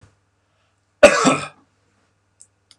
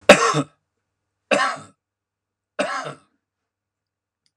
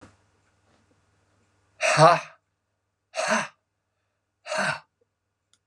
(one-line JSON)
{"cough_length": "2.8 s", "cough_amplitude": 32768, "cough_signal_mean_std_ratio": 0.25, "three_cough_length": "4.4 s", "three_cough_amplitude": 32768, "three_cough_signal_mean_std_ratio": 0.27, "exhalation_length": "5.7 s", "exhalation_amplitude": 25377, "exhalation_signal_mean_std_ratio": 0.29, "survey_phase": "beta (2021-08-13 to 2022-03-07)", "age": "65+", "gender": "Male", "wearing_mask": "No", "symptom_none": true, "smoker_status": "Ex-smoker", "respiratory_condition_asthma": false, "respiratory_condition_other": false, "recruitment_source": "REACT", "submission_delay": "2 days", "covid_test_result": "Negative", "covid_test_method": "RT-qPCR", "influenza_a_test_result": "Negative", "influenza_b_test_result": "Negative"}